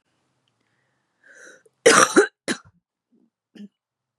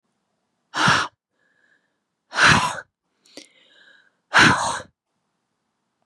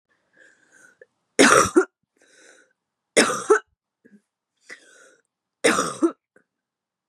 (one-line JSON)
{"cough_length": "4.2 s", "cough_amplitude": 31852, "cough_signal_mean_std_ratio": 0.24, "exhalation_length": "6.1 s", "exhalation_amplitude": 29013, "exhalation_signal_mean_std_ratio": 0.33, "three_cough_length": "7.1 s", "three_cough_amplitude": 32249, "three_cough_signal_mean_std_ratio": 0.29, "survey_phase": "beta (2021-08-13 to 2022-03-07)", "age": "18-44", "gender": "Female", "wearing_mask": "No", "symptom_cough_any": true, "symptom_new_continuous_cough": true, "symptom_shortness_of_breath": true, "symptom_sore_throat": true, "symptom_fatigue": true, "symptom_headache": true, "symptom_onset": "2 days", "smoker_status": "Never smoked", "respiratory_condition_asthma": false, "respiratory_condition_other": false, "recruitment_source": "Test and Trace", "submission_delay": "2 days", "covid_test_result": "Positive", "covid_test_method": "RT-qPCR", "covid_ct_value": 25.4, "covid_ct_gene": "ORF1ab gene"}